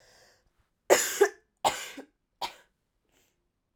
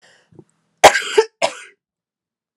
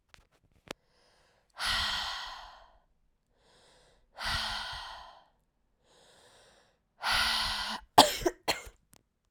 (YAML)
three_cough_length: 3.8 s
three_cough_amplitude: 21649
three_cough_signal_mean_std_ratio: 0.27
cough_length: 2.6 s
cough_amplitude: 32768
cough_signal_mean_std_ratio: 0.26
exhalation_length: 9.3 s
exhalation_amplitude: 21919
exhalation_signal_mean_std_ratio: 0.35
survey_phase: alpha (2021-03-01 to 2021-08-12)
age: 18-44
gender: Female
wearing_mask: 'No'
symptom_cough_any: true
symptom_fatigue: true
symptom_fever_high_temperature: true
symptom_headache: true
symptom_change_to_sense_of_smell_or_taste: true
symptom_loss_of_taste: true
symptom_onset: 4 days
smoker_status: Never smoked
respiratory_condition_asthma: false
respiratory_condition_other: false
recruitment_source: Test and Trace
submission_delay: 2 days
covid_test_result: Positive
covid_test_method: RT-qPCR
covid_ct_value: 15.1
covid_ct_gene: S gene
covid_ct_mean: 15.3
covid_viral_load: 9700000 copies/ml
covid_viral_load_category: High viral load (>1M copies/ml)